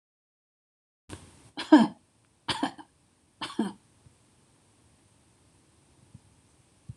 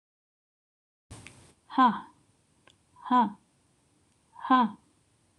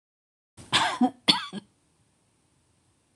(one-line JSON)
{"three_cough_length": "7.0 s", "three_cough_amplitude": 16380, "three_cough_signal_mean_std_ratio": 0.19, "exhalation_length": "5.4 s", "exhalation_amplitude": 9644, "exhalation_signal_mean_std_ratio": 0.29, "cough_length": "3.2 s", "cough_amplitude": 20834, "cough_signal_mean_std_ratio": 0.31, "survey_phase": "beta (2021-08-13 to 2022-03-07)", "age": "45-64", "gender": "Female", "wearing_mask": "No", "symptom_none": true, "smoker_status": "Never smoked", "respiratory_condition_asthma": false, "respiratory_condition_other": false, "recruitment_source": "REACT", "submission_delay": "3 days", "covid_test_result": "Negative", "covid_test_method": "RT-qPCR", "influenza_a_test_result": "Negative", "influenza_b_test_result": "Negative"}